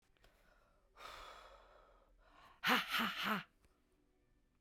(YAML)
exhalation_length: 4.6 s
exhalation_amplitude: 3427
exhalation_signal_mean_std_ratio: 0.37
survey_phase: beta (2021-08-13 to 2022-03-07)
age: 45-64
gender: Female
wearing_mask: 'No'
symptom_cough_any: true
symptom_runny_or_blocked_nose: true
symptom_fatigue: true
symptom_change_to_sense_of_smell_or_taste: true
symptom_onset: 5 days
smoker_status: Current smoker (1 to 10 cigarettes per day)
respiratory_condition_asthma: false
respiratory_condition_other: true
recruitment_source: Test and Trace
submission_delay: 3 days
covid_test_result: Positive
covid_test_method: RT-qPCR